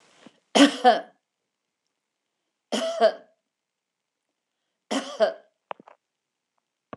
{"three_cough_length": "7.0 s", "three_cough_amplitude": 23288, "three_cough_signal_mean_std_ratio": 0.27, "survey_phase": "beta (2021-08-13 to 2022-03-07)", "age": "65+", "gender": "Female", "wearing_mask": "No", "symptom_none": true, "smoker_status": "Ex-smoker", "respiratory_condition_asthma": false, "respiratory_condition_other": false, "recruitment_source": "REACT", "submission_delay": "2 days", "covid_test_result": "Negative", "covid_test_method": "RT-qPCR", "influenza_a_test_result": "Negative", "influenza_b_test_result": "Negative"}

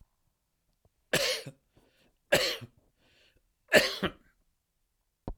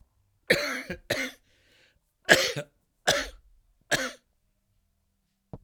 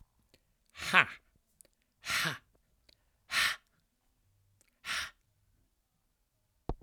{"three_cough_length": "5.4 s", "three_cough_amplitude": 18255, "three_cough_signal_mean_std_ratio": 0.28, "cough_length": "5.6 s", "cough_amplitude": 26107, "cough_signal_mean_std_ratio": 0.32, "exhalation_length": "6.8 s", "exhalation_amplitude": 16016, "exhalation_signal_mean_std_ratio": 0.26, "survey_phase": "alpha (2021-03-01 to 2021-08-12)", "age": "65+", "gender": "Male", "wearing_mask": "No", "symptom_new_continuous_cough": true, "symptom_change_to_sense_of_smell_or_taste": true, "smoker_status": "Never smoked", "respiratory_condition_asthma": false, "respiratory_condition_other": false, "recruitment_source": "Test and Trace", "submission_delay": "1 day", "covid_test_result": "Positive", "covid_test_method": "RT-qPCR"}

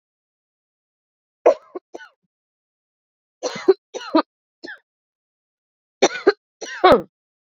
{"three_cough_length": "7.6 s", "three_cough_amplitude": 27630, "three_cough_signal_mean_std_ratio": 0.24, "survey_phase": "beta (2021-08-13 to 2022-03-07)", "age": "18-44", "gender": "Female", "wearing_mask": "No", "symptom_cough_any": true, "symptom_shortness_of_breath": true, "symptom_abdominal_pain": true, "symptom_headache": true, "symptom_loss_of_taste": true, "symptom_onset": "2 days", "smoker_status": "Never smoked", "respiratory_condition_asthma": false, "respiratory_condition_other": false, "recruitment_source": "Test and Trace", "submission_delay": "2 days", "covid_test_result": "Positive", "covid_test_method": "RT-qPCR", "covid_ct_value": 15.1, "covid_ct_gene": "N gene", "covid_ct_mean": 15.2, "covid_viral_load": "10000000 copies/ml", "covid_viral_load_category": "High viral load (>1M copies/ml)"}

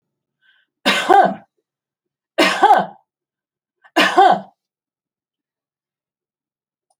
{"three_cough_length": "7.0 s", "three_cough_amplitude": 29086, "three_cough_signal_mean_std_ratio": 0.33, "survey_phase": "beta (2021-08-13 to 2022-03-07)", "age": "65+", "gender": "Female", "wearing_mask": "No", "symptom_none": true, "smoker_status": "Never smoked", "respiratory_condition_asthma": false, "respiratory_condition_other": false, "recruitment_source": "Test and Trace", "submission_delay": "0 days", "covid_test_result": "Negative", "covid_test_method": "LFT"}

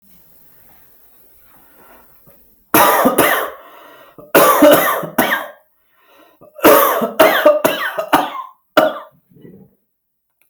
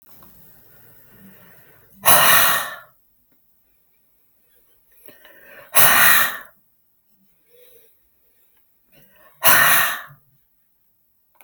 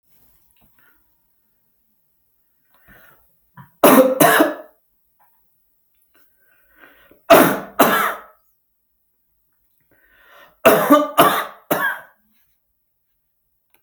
{"cough_length": "10.5 s", "cough_amplitude": 32768, "cough_signal_mean_std_ratio": 0.46, "exhalation_length": "11.4 s", "exhalation_amplitude": 32768, "exhalation_signal_mean_std_ratio": 0.33, "three_cough_length": "13.8 s", "three_cough_amplitude": 32768, "three_cough_signal_mean_std_ratio": 0.31, "survey_phase": "beta (2021-08-13 to 2022-03-07)", "age": "45-64", "gender": "Male", "wearing_mask": "No", "symptom_none": true, "smoker_status": "Never smoked", "respiratory_condition_asthma": false, "respiratory_condition_other": false, "recruitment_source": "REACT", "submission_delay": "1 day", "covid_test_result": "Negative", "covid_test_method": "RT-qPCR", "influenza_a_test_result": "Negative", "influenza_b_test_result": "Negative"}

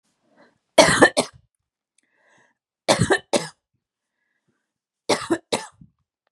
{"three_cough_length": "6.3 s", "three_cough_amplitude": 32767, "three_cough_signal_mean_std_ratio": 0.28, "survey_phase": "beta (2021-08-13 to 2022-03-07)", "age": "45-64", "gender": "Female", "wearing_mask": "No", "symptom_none": true, "smoker_status": "Ex-smoker", "respiratory_condition_asthma": false, "respiratory_condition_other": false, "recruitment_source": "REACT", "submission_delay": "2 days", "covid_test_result": "Negative", "covid_test_method": "RT-qPCR", "influenza_a_test_result": "Negative", "influenza_b_test_result": "Negative"}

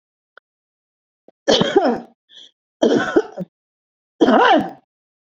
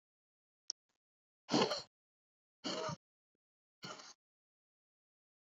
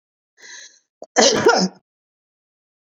{"three_cough_length": "5.4 s", "three_cough_amplitude": 32767, "three_cough_signal_mean_std_ratio": 0.41, "exhalation_length": "5.5 s", "exhalation_amplitude": 4212, "exhalation_signal_mean_std_ratio": 0.25, "cough_length": "2.8 s", "cough_amplitude": 29626, "cough_signal_mean_std_ratio": 0.35, "survey_phase": "beta (2021-08-13 to 2022-03-07)", "age": "45-64", "gender": "Female", "wearing_mask": "No", "symptom_sore_throat": true, "smoker_status": "Never smoked", "respiratory_condition_asthma": false, "respiratory_condition_other": false, "recruitment_source": "REACT", "submission_delay": "2 days", "covid_test_result": "Negative", "covid_test_method": "RT-qPCR"}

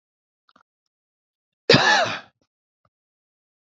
{"cough_length": "3.8 s", "cough_amplitude": 28017, "cough_signal_mean_std_ratio": 0.26, "survey_phase": "beta (2021-08-13 to 2022-03-07)", "age": "65+", "gender": "Male", "wearing_mask": "No", "symptom_cough_any": true, "smoker_status": "Ex-smoker", "respiratory_condition_asthma": false, "respiratory_condition_other": false, "recruitment_source": "REACT", "submission_delay": "1 day", "covid_test_result": "Negative", "covid_test_method": "RT-qPCR", "influenza_a_test_result": "Unknown/Void", "influenza_b_test_result": "Unknown/Void"}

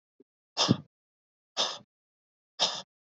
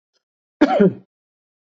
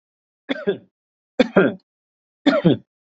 {"exhalation_length": "3.2 s", "exhalation_amplitude": 11559, "exhalation_signal_mean_std_ratio": 0.29, "cough_length": "1.7 s", "cough_amplitude": 27327, "cough_signal_mean_std_ratio": 0.33, "three_cough_length": "3.1 s", "three_cough_amplitude": 27333, "three_cough_signal_mean_std_ratio": 0.35, "survey_phase": "beta (2021-08-13 to 2022-03-07)", "age": "45-64", "gender": "Male", "wearing_mask": "No", "symptom_none": true, "smoker_status": "Ex-smoker", "respiratory_condition_asthma": false, "respiratory_condition_other": false, "recruitment_source": "REACT", "submission_delay": "1 day", "covid_test_result": "Negative", "covid_test_method": "RT-qPCR", "influenza_a_test_result": "Negative", "influenza_b_test_result": "Negative"}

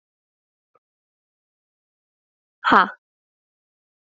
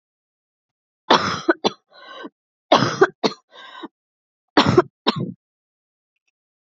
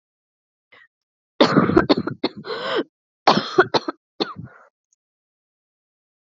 {"exhalation_length": "4.2 s", "exhalation_amplitude": 27282, "exhalation_signal_mean_std_ratio": 0.16, "three_cough_length": "6.7 s", "three_cough_amplitude": 30082, "three_cough_signal_mean_std_ratio": 0.31, "cough_length": "6.3 s", "cough_amplitude": 31147, "cough_signal_mean_std_ratio": 0.33, "survey_phase": "alpha (2021-03-01 to 2021-08-12)", "age": "18-44", "gender": "Female", "wearing_mask": "No", "symptom_cough_any": true, "symptom_new_continuous_cough": true, "symptom_shortness_of_breath": true, "symptom_abdominal_pain": true, "symptom_diarrhoea": true, "symptom_fatigue": true, "symptom_headache": true, "symptom_change_to_sense_of_smell_or_taste": true, "symptom_loss_of_taste": true, "symptom_onset": "3 days", "smoker_status": "Ex-smoker", "respiratory_condition_asthma": false, "respiratory_condition_other": false, "recruitment_source": "Test and Trace", "submission_delay": "2 days", "covid_test_result": "Positive", "covid_test_method": "RT-qPCR", "covid_ct_value": 19.5, "covid_ct_gene": "ORF1ab gene"}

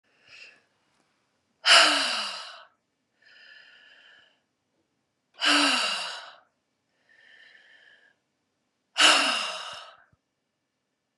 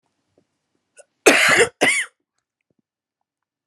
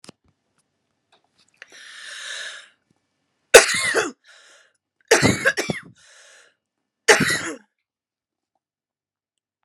{"exhalation_length": "11.2 s", "exhalation_amplitude": 22536, "exhalation_signal_mean_std_ratio": 0.32, "cough_length": "3.7 s", "cough_amplitude": 32767, "cough_signal_mean_std_ratio": 0.33, "three_cough_length": "9.6 s", "three_cough_amplitude": 32768, "three_cough_signal_mean_std_ratio": 0.26, "survey_phase": "beta (2021-08-13 to 2022-03-07)", "age": "45-64", "gender": "Female", "wearing_mask": "No", "symptom_none": true, "smoker_status": "Never smoked", "respiratory_condition_asthma": true, "respiratory_condition_other": false, "recruitment_source": "Test and Trace", "submission_delay": "1 day", "covid_test_result": "Positive", "covid_test_method": "ePCR"}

